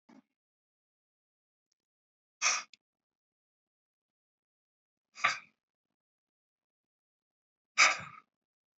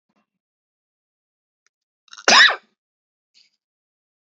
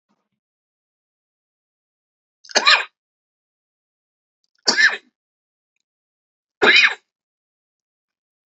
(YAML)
exhalation_length: 8.8 s
exhalation_amplitude: 10740
exhalation_signal_mean_std_ratio: 0.18
cough_length: 4.3 s
cough_amplitude: 32462
cough_signal_mean_std_ratio: 0.19
three_cough_length: 8.5 s
three_cough_amplitude: 32768
three_cough_signal_mean_std_ratio: 0.23
survey_phase: alpha (2021-03-01 to 2021-08-12)
age: 18-44
gender: Male
wearing_mask: 'No'
symptom_cough_any: true
symptom_fatigue: true
symptom_onset: 4 days
smoker_status: Never smoked
respiratory_condition_asthma: false
respiratory_condition_other: false
recruitment_source: Test and Trace
submission_delay: 2 days
covid_test_result: Positive
covid_test_method: RT-qPCR
covid_ct_value: 18.0
covid_ct_gene: ORF1ab gene
covid_ct_mean: 18.3
covid_viral_load: 970000 copies/ml
covid_viral_load_category: Low viral load (10K-1M copies/ml)